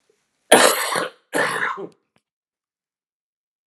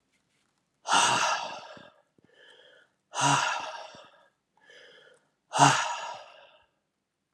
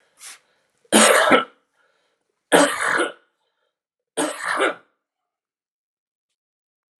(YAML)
cough_length: 3.7 s
cough_amplitude: 32768
cough_signal_mean_std_ratio: 0.35
exhalation_length: 7.3 s
exhalation_amplitude: 19132
exhalation_signal_mean_std_ratio: 0.38
three_cough_length: 7.0 s
three_cough_amplitude: 31571
three_cough_signal_mean_std_ratio: 0.35
survey_phase: alpha (2021-03-01 to 2021-08-12)
age: 45-64
gender: Male
wearing_mask: 'No'
symptom_cough_any: true
symptom_shortness_of_breath: true
symptom_diarrhoea: true
symptom_fatigue: true
symptom_onset: 5 days
smoker_status: Never smoked
respiratory_condition_asthma: false
respiratory_condition_other: false
recruitment_source: Test and Trace
submission_delay: 2 days
covid_test_result: Positive
covid_test_method: RT-qPCR
covid_ct_value: 19.4
covid_ct_gene: ORF1ab gene
covid_ct_mean: 19.6
covid_viral_load: 380000 copies/ml
covid_viral_load_category: Low viral load (10K-1M copies/ml)